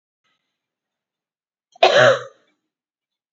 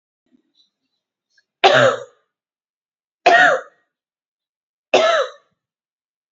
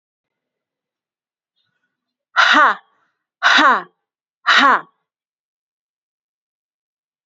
{"cough_length": "3.3 s", "cough_amplitude": 27668, "cough_signal_mean_std_ratio": 0.26, "three_cough_length": "6.3 s", "three_cough_amplitude": 29017, "three_cough_signal_mean_std_ratio": 0.32, "exhalation_length": "7.3 s", "exhalation_amplitude": 32768, "exhalation_signal_mean_std_ratio": 0.31, "survey_phase": "beta (2021-08-13 to 2022-03-07)", "age": "18-44", "gender": "Female", "wearing_mask": "No", "symptom_headache": true, "symptom_onset": "12 days", "smoker_status": "Ex-smoker", "respiratory_condition_asthma": false, "respiratory_condition_other": false, "recruitment_source": "REACT", "submission_delay": "1 day", "covid_test_result": "Negative", "covid_test_method": "RT-qPCR"}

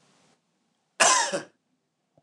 {"cough_length": "2.2 s", "cough_amplitude": 23997, "cough_signal_mean_std_ratio": 0.32, "survey_phase": "beta (2021-08-13 to 2022-03-07)", "age": "18-44", "gender": "Male", "wearing_mask": "No", "symptom_none": true, "smoker_status": "Never smoked", "respiratory_condition_asthma": false, "respiratory_condition_other": false, "recruitment_source": "REACT", "submission_delay": "1 day", "covid_test_result": "Negative", "covid_test_method": "RT-qPCR", "influenza_a_test_result": "Negative", "influenza_b_test_result": "Negative"}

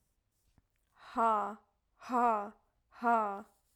{"exhalation_length": "3.8 s", "exhalation_amplitude": 4272, "exhalation_signal_mean_std_ratio": 0.43, "survey_phase": "alpha (2021-03-01 to 2021-08-12)", "age": "18-44", "gender": "Female", "wearing_mask": "No", "symptom_none": true, "smoker_status": "Never smoked", "respiratory_condition_asthma": false, "respiratory_condition_other": false, "recruitment_source": "REACT", "submission_delay": "1 day", "covid_test_result": "Negative", "covid_test_method": "RT-qPCR"}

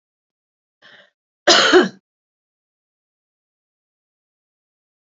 {"cough_length": "5.0 s", "cough_amplitude": 29744, "cough_signal_mean_std_ratio": 0.22, "survey_phase": "beta (2021-08-13 to 2022-03-07)", "age": "45-64", "gender": "Female", "wearing_mask": "No", "symptom_cough_any": true, "symptom_runny_or_blocked_nose": true, "symptom_onset": "8 days", "smoker_status": "Never smoked", "respiratory_condition_asthma": false, "respiratory_condition_other": false, "recruitment_source": "REACT", "submission_delay": "2 days", "covid_test_result": "Positive", "covid_test_method": "RT-qPCR", "covid_ct_value": 25.0, "covid_ct_gene": "E gene", "influenza_a_test_result": "Negative", "influenza_b_test_result": "Negative"}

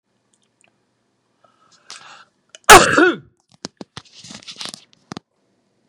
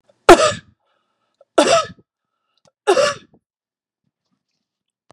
{"cough_length": "5.9 s", "cough_amplitude": 32768, "cough_signal_mean_std_ratio": 0.21, "three_cough_length": "5.1 s", "three_cough_amplitude": 32768, "three_cough_signal_mean_std_ratio": 0.28, "survey_phase": "beta (2021-08-13 to 2022-03-07)", "age": "65+", "gender": "Male", "wearing_mask": "No", "symptom_none": true, "smoker_status": "Never smoked", "respiratory_condition_asthma": false, "respiratory_condition_other": false, "recruitment_source": "REACT", "submission_delay": "1 day", "covid_test_result": "Negative", "covid_test_method": "RT-qPCR", "influenza_a_test_result": "Negative", "influenza_b_test_result": "Negative"}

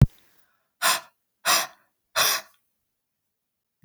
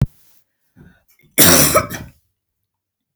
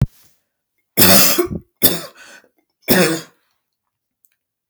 {"exhalation_length": "3.8 s", "exhalation_amplitude": 22345, "exhalation_signal_mean_std_ratio": 0.3, "cough_length": "3.2 s", "cough_amplitude": 32768, "cough_signal_mean_std_ratio": 0.33, "three_cough_length": "4.7 s", "three_cough_amplitude": 32768, "three_cough_signal_mean_std_ratio": 0.37, "survey_phase": "beta (2021-08-13 to 2022-03-07)", "age": "45-64", "gender": "Female", "wearing_mask": "No", "symptom_none": true, "smoker_status": "Never smoked", "respiratory_condition_asthma": false, "respiratory_condition_other": false, "recruitment_source": "REACT", "submission_delay": "2 days", "covid_test_result": "Negative", "covid_test_method": "RT-qPCR", "influenza_a_test_result": "Negative", "influenza_b_test_result": "Negative"}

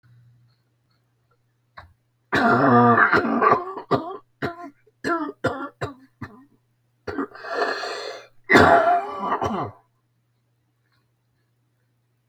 {"cough_length": "12.3 s", "cough_amplitude": 31991, "cough_signal_mean_std_ratio": 0.43, "survey_phase": "beta (2021-08-13 to 2022-03-07)", "age": "65+", "gender": "Male", "wearing_mask": "No", "symptom_cough_any": true, "symptom_runny_or_blocked_nose": true, "symptom_shortness_of_breath": true, "symptom_change_to_sense_of_smell_or_taste": true, "symptom_loss_of_taste": true, "smoker_status": "Current smoker (1 to 10 cigarettes per day)", "respiratory_condition_asthma": false, "respiratory_condition_other": true, "recruitment_source": "REACT", "submission_delay": "2 days", "covid_test_result": "Negative", "covid_test_method": "RT-qPCR", "influenza_a_test_result": "Negative", "influenza_b_test_result": "Negative"}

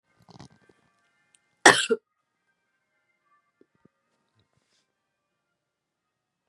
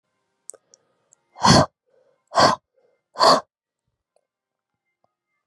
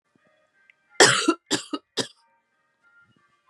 {"cough_length": "6.5 s", "cough_amplitude": 32338, "cough_signal_mean_std_ratio": 0.13, "exhalation_length": "5.5 s", "exhalation_amplitude": 29640, "exhalation_signal_mean_std_ratio": 0.27, "three_cough_length": "3.5 s", "three_cough_amplitude": 32648, "three_cough_signal_mean_std_ratio": 0.27, "survey_phase": "beta (2021-08-13 to 2022-03-07)", "age": "18-44", "gender": "Female", "wearing_mask": "No", "symptom_cough_any": true, "symptom_new_continuous_cough": true, "symptom_runny_or_blocked_nose": true, "symptom_shortness_of_breath": true, "symptom_fatigue": true, "symptom_fever_high_temperature": true, "symptom_onset": "4 days", "smoker_status": "Never smoked", "respiratory_condition_asthma": false, "respiratory_condition_other": false, "recruitment_source": "Test and Trace", "submission_delay": "2 days", "covid_test_result": "Positive", "covid_test_method": "RT-qPCR", "covid_ct_value": 19.6, "covid_ct_gene": "N gene", "covid_ct_mean": 19.6, "covid_viral_load": "390000 copies/ml", "covid_viral_load_category": "Low viral load (10K-1M copies/ml)"}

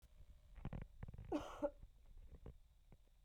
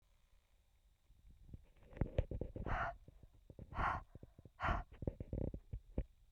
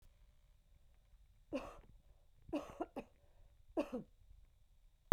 {"cough_length": "3.2 s", "cough_amplitude": 937, "cough_signal_mean_std_ratio": 0.56, "exhalation_length": "6.3 s", "exhalation_amplitude": 2496, "exhalation_signal_mean_std_ratio": 0.46, "three_cough_length": "5.1 s", "three_cough_amplitude": 8649, "three_cough_signal_mean_std_ratio": 0.33, "survey_phase": "beta (2021-08-13 to 2022-03-07)", "age": "45-64", "gender": "Female", "wearing_mask": "No", "symptom_cough_any": true, "symptom_runny_or_blocked_nose": true, "symptom_change_to_sense_of_smell_or_taste": true, "symptom_loss_of_taste": true, "symptom_onset": "4 days", "smoker_status": "Never smoked", "respiratory_condition_asthma": false, "respiratory_condition_other": false, "recruitment_source": "Test and Trace", "submission_delay": "2 days", "covid_test_result": "Positive", "covid_test_method": "ePCR"}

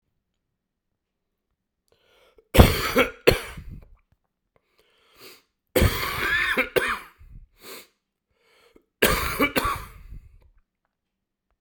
{"three_cough_length": "11.6 s", "three_cough_amplitude": 32768, "three_cough_signal_mean_std_ratio": 0.33, "survey_phase": "beta (2021-08-13 to 2022-03-07)", "age": "45-64", "gender": "Male", "wearing_mask": "No", "symptom_cough_any": true, "symptom_sore_throat": true, "symptom_fatigue": true, "symptom_fever_high_temperature": true, "symptom_onset": "3 days", "smoker_status": "Never smoked", "respiratory_condition_asthma": false, "respiratory_condition_other": false, "recruitment_source": "Test and Trace", "submission_delay": "1 day", "covid_test_result": "Positive", "covid_test_method": "RT-qPCR", "covid_ct_value": 17.0, "covid_ct_gene": "ORF1ab gene", "covid_ct_mean": 17.5, "covid_viral_load": "1800000 copies/ml", "covid_viral_load_category": "High viral load (>1M copies/ml)"}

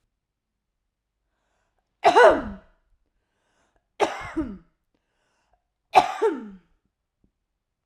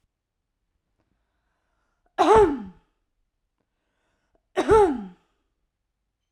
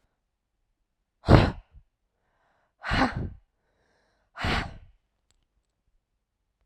{"three_cough_length": "7.9 s", "three_cough_amplitude": 30223, "three_cough_signal_mean_std_ratio": 0.25, "cough_length": "6.3 s", "cough_amplitude": 19625, "cough_signal_mean_std_ratio": 0.28, "exhalation_length": "6.7 s", "exhalation_amplitude": 32768, "exhalation_signal_mean_std_ratio": 0.24, "survey_phase": "beta (2021-08-13 to 2022-03-07)", "age": "18-44", "gender": "Female", "wearing_mask": "No", "symptom_none": true, "smoker_status": "Current smoker (1 to 10 cigarettes per day)", "respiratory_condition_asthma": false, "respiratory_condition_other": false, "recruitment_source": "REACT", "submission_delay": "1 day", "covid_test_result": "Negative", "covid_test_method": "RT-qPCR", "influenza_a_test_result": "Negative", "influenza_b_test_result": "Negative"}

